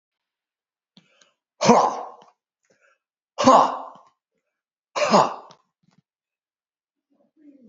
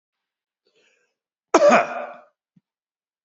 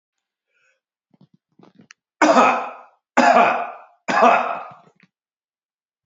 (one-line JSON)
{"exhalation_length": "7.7 s", "exhalation_amplitude": 32513, "exhalation_signal_mean_std_ratio": 0.28, "cough_length": "3.2 s", "cough_amplitude": 27741, "cough_signal_mean_std_ratio": 0.27, "three_cough_length": "6.1 s", "three_cough_amplitude": 31194, "three_cough_signal_mean_std_ratio": 0.38, "survey_phase": "beta (2021-08-13 to 2022-03-07)", "age": "65+", "gender": "Male", "wearing_mask": "No", "symptom_cough_any": true, "symptom_runny_or_blocked_nose": true, "symptom_sore_throat": true, "smoker_status": "Ex-smoker", "respiratory_condition_asthma": false, "respiratory_condition_other": false, "recruitment_source": "Test and Trace", "submission_delay": "1 day", "covid_test_result": "Positive", "covid_test_method": "RT-qPCR", "covid_ct_value": 39.2, "covid_ct_gene": "N gene"}